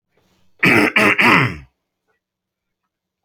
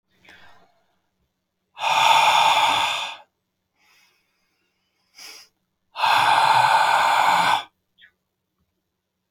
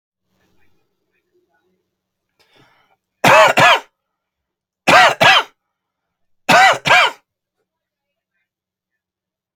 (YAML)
cough_length: 3.2 s
cough_amplitude: 29778
cough_signal_mean_std_ratio: 0.41
exhalation_length: 9.3 s
exhalation_amplitude: 21057
exhalation_signal_mean_std_ratio: 0.49
three_cough_length: 9.6 s
three_cough_amplitude: 31620
three_cough_signal_mean_std_ratio: 0.33
survey_phase: beta (2021-08-13 to 2022-03-07)
age: 18-44
gender: Male
wearing_mask: 'No'
symptom_none: true
smoker_status: Never smoked
respiratory_condition_asthma: false
respiratory_condition_other: false
recruitment_source: REACT
submission_delay: 2 days
covid_test_result: Negative
covid_test_method: RT-qPCR